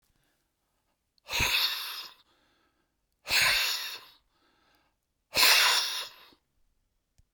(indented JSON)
{
  "exhalation_length": "7.3 s",
  "exhalation_amplitude": 14790,
  "exhalation_signal_mean_std_ratio": 0.4,
  "survey_phase": "beta (2021-08-13 to 2022-03-07)",
  "age": "45-64",
  "gender": "Male",
  "wearing_mask": "No",
  "symptom_none": true,
  "smoker_status": "Never smoked",
  "respiratory_condition_asthma": false,
  "respiratory_condition_other": true,
  "recruitment_source": "REACT",
  "submission_delay": "2 days",
  "covid_test_result": "Negative",
  "covid_test_method": "RT-qPCR"
}